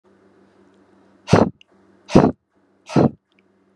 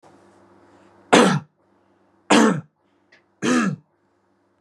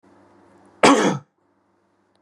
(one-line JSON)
{"exhalation_length": "3.8 s", "exhalation_amplitude": 32768, "exhalation_signal_mean_std_ratio": 0.28, "three_cough_length": "4.6 s", "three_cough_amplitude": 32750, "three_cough_signal_mean_std_ratio": 0.35, "cough_length": "2.2 s", "cough_amplitude": 32767, "cough_signal_mean_std_ratio": 0.3, "survey_phase": "beta (2021-08-13 to 2022-03-07)", "age": "18-44", "gender": "Male", "wearing_mask": "No", "symptom_none": true, "smoker_status": "Never smoked", "recruitment_source": "REACT", "submission_delay": "1 day", "covid_test_result": "Negative", "covid_test_method": "RT-qPCR", "influenza_a_test_result": "Negative", "influenza_b_test_result": "Negative"}